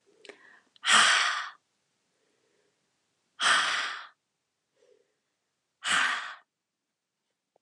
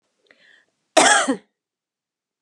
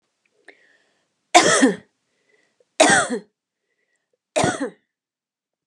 {
  "exhalation_length": "7.6 s",
  "exhalation_amplitude": 14180,
  "exhalation_signal_mean_std_ratio": 0.35,
  "cough_length": "2.4 s",
  "cough_amplitude": 32767,
  "cough_signal_mean_std_ratio": 0.31,
  "three_cough_length": "5.7 s",
  "three_cough_amplitude": 32758,
  "three_cough_signal_mean_std_ratio": 0.32,
  "survey_phase": "alpha (2021-03-01 to 2021-08-12)",
  "age": "45-64",
  "gender": "Female",
  "wearing_mask": "No",
  "symptom_none": true,
  "smoker_status": "Never smoked",
  "respiratory_condition_asthma": false,
  "respiratory_condition_other": false,
  "recruitment_source": "REACT",
  "submission_delay": "3 days",
  "covid_test_result": "Negative",
  "covid_test_method": "RT-qPCR"
}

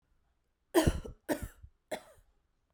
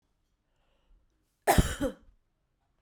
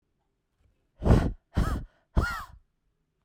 {
  "three_cough_length": "2.7 s",
  "three_cough_amplitude": 8626,
  "three_cough_signal_mean_std_ratio": 0.3,
  "cough_length": "2.8 s",
  "cough_amplitude": 12165,
  "cough_signal_mean_std_ratio": 0.25,
  "exhalation_length": "3.2 s",
  "exhalation_amplitude": 15654,
  "exhalation_signal_mean_std_ratio": 0.37,
  "survey_phase": "beta (2021-08-13 to 2022-03-07)",
  "age": "18-44",
  "gender": "Female",
  "wearing_mask": "No",
  "symptom_runny_or_blocked_nose": true,
  "symptom_sore_throat": true,
  "symptom_other": true,
  "symptom_onset": "3 days",
  "smoker_status": "Never smoked",
  "respiratory_condition_asthma": false,
  "respiratory_condition_other": false,
  "recruitment_source": "Test and Trace",
  "submission_delay": "1 day",
  "covid_test_result": "Positive",
  "covid_test_method": "RT-qPCR",
  "covid_ct_value": 20.7,
  "covid_ct_gene": "ORF1ab gene"
}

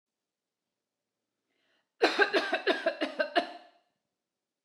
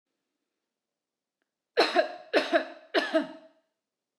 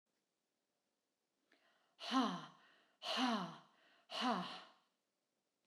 {
  "cough_length": "4.6 s",
  "cough_amplitude": 9663,
  "cough_signal_mean_std_ratio": 0.36,
  "three_cough_length": "4.2 s",
  "three_cough_amplitude": 12321,
  "three_cough_signal_mean_std_ratio": 0.35,
  "exhalation_length": "5.7 s",
  "exhalation_amplitude": 2124,
  "exhalation_signal_mean_std_ratio": 0.39,
  "survey_phase": "alpha (2021-03-01 to 2021-08-12)",
  "age": "45-64",
  "gender": "Female",
  "wearing_mask": "No",
  "symptom_none": true,
  "smoker_status": "Ex-smoker",
  "respiratory_condition_asthma": false,
  "respiratory_condition_other": false,
  "recruitment_source": "REACT",
  "submission_delay": "1 day",
  "covid_test_result": "Negative",
  "covid_test_method": "RT-qPCR"
}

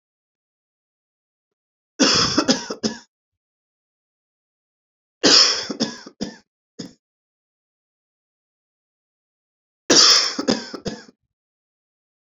{
  "three_cough_length": "12.2 s",
  "three_cough_amplitude": 32768,
  "three_cough_signal_mean_std_ratio": 0.3,
  "survey_phase": "beta (2021-08-13 to 2022-03-07)",
  "age": "18-44",
  "gender": "Male",
  "wearing_mask": "No",
  "symptom_cough_any": true,
  "symptom_new_continuous_cough": true,
  "symptom_runny_or_blocked_nose": true,
  "symptom_sore_throat": true,
  "symptom_onset": "4 days",
  "smoker_status": "Never smoked",
  "respiratory_condition_asthma": false,
  "respiratory_condition_other": false,
  "recruitment_source": "Test and Trace",
  "submission_delay": "1 day",
  "covid_test_result": "Negative",
  "covid_test_method": "RT-qPCR"
}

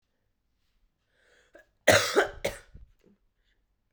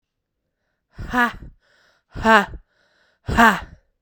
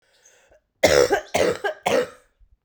{
  "cough_length": "3.9 s",
  "cough_amplitude": 22137,
  "cough_signal_mean_std_ratio": 0.25,
  "exhalation_length": "4.0 s",
  "exhalation_amplitude": 32767,
  "exhalation_signal_mean_std_ratio": 0.33,
  "three_cough_length": "2.6 s",
  "three_cough_amplitude": 27852,
  "three_cough_signal_mean_std_ratio": 0.46,
  "survey_phase": "beta (2021-08-13 to 2022-03-07)",
  "age": "18-44",
  "gender": "Female",
  "wearing_mask": "No",
  "symptom_cough_any": true,
  "symptom_new_continuous_cough": true,
  "symptom_runny_or_blocked_nose": true,
  "symptom_shortness_of_breath": true,
  "symptom_sore_throat": true,
  "symptom_fatigue": true,
  "symptom_fever_high_temperature": true,
  "symptom_headache": true,
  "symptom_change_to_sense_of_smell_or_taste": true,
  "symptom_onset": "6 days",
  "smoker_status": "Never smoked",
  "respiratory_condition_asthma": true,
  "respiratory_condition_other": false,
  "recruitment_source": "Test and Trace",
  "submission_delay": "1 day",
  "covid_test_result": "Positive",
  "covid_test_method": "RT-qPCR",
  "covid_ct_value": 13.2,
  "covid_ct_gene": "ORF1ab gene",
  "covid_ct_mean": 13.6,
  "covid_viral_load": "34000000 copies/ml",
  "covid_viral_load_category": "High viral load (>1M copies/ml)"
}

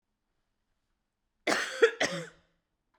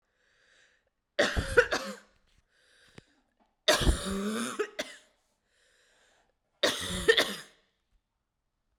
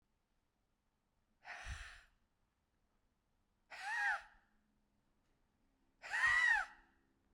{
  "cough_length": "3.0 s",
  "cough_amplitude": 10958,
  "cough_signal_mean_std_ratio": 0.3,
  "three_cough_length": "8.8 s",
  "three_cough_amplitude": 13952,
  "three_cough_signal_mean_std_ratio": 0.35,
  "exhalation_length": "7.3 s",
  "exhalation_amplitude": 2304,
  "exhalation_signal_mean_std_ratio": 0.33,
  "survey_phase": "beta (2021-08-13 to 2022-03-07)",
  "age": "18-44",
  "gender": "Female",
  "wearing_mask": "No",
  "symptom_fatigue": true,
  "smoker_status": "Never smoked",
  "respiratory_condition_asthma": false,
  "respiratory_condition_other": false,
  "recruitment_source": "Test and Trace",
  "submission_delay": "2 days",
  "covid_test_result": "Positive",
  "covid_test_method": "ePCR"
}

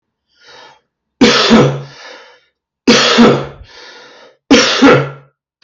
{
  "three_cough_length": "5.6 s",
  "three_cough_amplitude": 32768,
  "three_cough_signal_mean_std_ratio": 0.49,
  "survey_phase": "beta (2021-08-13 to 2022-03-07)",
  "age": "65+",
  "gender": "Male",
  "wearing_mask": "No",
  "symptom_cough_any": true,
  "symptom_sore_throat": true,
  "smoker_status": "Never smoked",
  "respiratory_condition_asthma": false,
  "respiratory_condition_other": false,
  "recruitment_source": "REACT",
  "submission_delay": "9 days",
  "covid_test_result": "Negative",
  "covid_test_method": "RT-qPCR",
  "influenza_a_test_result": "Negative",
  "influenza_b_test_result": "Negative"
}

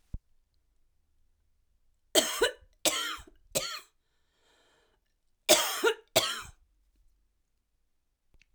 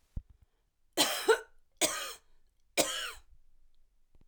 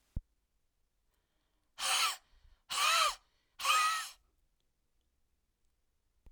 {
  "cough_length": "8.5 s",
  "cough_amplitude": 15722,
  "cough_signal_mean_std_ratio": 0.3,
  "three_cough_length": "4.3 s",
  "three_cough_amplitude": 8388,
  "three_cough_signal_mean_std_ratio": 0.36,
  "exhalation_length": "6.3 s",
  "exhalation_amplitude": 5717,
  "exhalation_signal_mean_std_ratio": 0.37,
  "survey_phase": "alpha (2021-03-01 to 2021-08-12)",
  "age": "45-64",
  "gender": "Female",
  "wearing_mask": "No",
  "symptom_none": true,
  "smoker_status": "Never smoked",
  "respiratory_condition_asthma": false,
  "respiratory_condition_other": false,
  "recruitment_source": "REACT",
  "submission_delay": "2 days",
  "covid_test_result": "Negative",
  "covid_test_method": "RT-qPCR"
}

